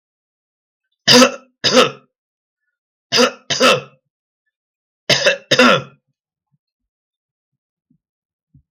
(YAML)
three_cough_length: 8.7 s
three_cough_amplitude: 32768
three_cough_signal_mean_std_ratio: 0.33
survey_phase: beta (2021-08-13 to 2022-03-07)
age: 65+
gender: Male
wearing_mask: 'No'
symptom_none: true
smoker_status: Never smoked
respiratory_condition_asthma: true
respiratory_condition_other: false
recruitment_source: REACT
submission_delay: 1 day
covid_test_result: Negative
covid_test_method: RT-qPCR
influenza_a_test_result: Negative
influenza_b_test_result: Negative